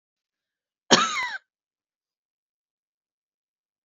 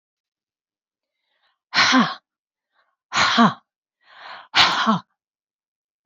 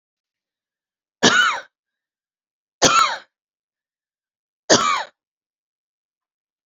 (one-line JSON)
{"cough_length": "3.8 s", "cough_amplitude": 25942, "cough_signal_mean_std_ratio": 0.21, "exhalation_length": "6.1 s", "exhalation_amplitude": 27816, "exhalation_signal_mean_std_ratio": 0.35, "three_cough_length": "6.7 s", "three_cough_amplitude": 31476, "three_cough_signal_mean_std_ratio": 0.3, "survey_phase": "beta (2021-08-13 to 2022-03-07)", "age": "65+", "gender": "Female", "wearing_mask": "No", "symptom_cough_any": true, "symptom_runny_or_blocked_nose": true, "symptom_onset": "12 days", "smoker_status": "Never smoked", "respiratory_condition_asthma": false, "respiratory_condition_other": false, "recruitment_source": "REACT", "submission_delay": "1 day", "covid_test_result": "Negative", "covid_test_method": "RT-qPCR"}